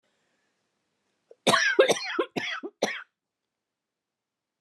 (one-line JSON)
{"cough_length": "4.6 s", "cough_amplitude": 16493, "cough_signal_mean_std_ratio": 0.34, "survey_phase": "beta (2021-08-13 to 2022-03-07)", "age": "45-64", "gender": "Female", "wearing_mask": "No", "symptom_new_continuous_cough": true, "symptom_runny_or_blocked_nose": true, "symptom_fatigue": true, "symptom_headache": true, "symptom_change_to_sense_of_smell_or_taste": true, "symptom_loss_of_taste": true, "symptom_onset": "5 days", "smoker_status": "Never smoked", "respiratory_condition_asthma": true, "respiratory_condition_other": false, "recruitment_source": "Test and Trace", "submission_delay": "4 days", "covid_test_result": "Positive", "covid_test_method": "ePCR"}